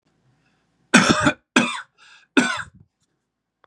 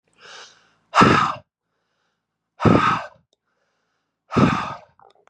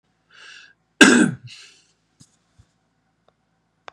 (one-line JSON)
{"three_cough_length": "3.7 s", "three_cough_amplitude": 32767, "three_cough_signal_mean_std_ratio": 0.34, "exhalation_length": "5.3 s", "exhalation_amplitude": 30658, "exhalation_signal_mean_std_ratio": 0.36, "cough_length": "3.9 s", "cough_amplitude": 32768, "cough_signal_mean_std_ratio": 0.23, "survey_phase": "beta (2021-08-13 to 2022-03-07)", "age": "18-44", "gender": "Male", "wearing_mask": "No", "symptom_none": true, "smoker_status": "Never smoked", "respiratory_condition_asthma": false, "respiratory_condition_other": false, "recruitment_source": "Test and Trace", "submission_delay": "1 day", "covid_test_result": "Negative", "covid_test_method": "ePCR"}